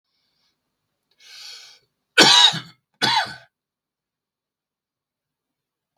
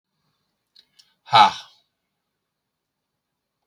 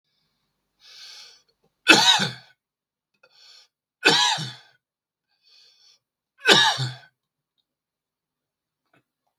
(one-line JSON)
{"cough_length": "6.0 s", "cough_amplitude": 32768, "cough_signal_mean_std_ratio": 0.25, "exhalation_length": "3.7 s", "exhalation_amplitude": 31813, "exhalation_signal_mean_std_ratio": 0.18, "three_cough_length": "9.4 s", "three_cough_amplitude": 32768, "three_cough_signal_mean_std_ratio": 0.28, "survey_phase": "beta (2021-08-13 to 2022-03-07)", "age": "65+", "gender": "Male", "wearing_mask": "No", "symptom_cough_any": true, "symptom_new_continuous_cough": true, "symptom_sore_throat": true, "symptom_fever_high_temperature": true, "symptom_headache": true, "smoker_status": "Never smoked", "respiratory_condition_asthma": false, "respiratory_condition_other": false, "recruitment_source": "Test and Trace", "submission_delay": "2 days", "covid_test_result": "Positive", "covid_test_method": "LFT"}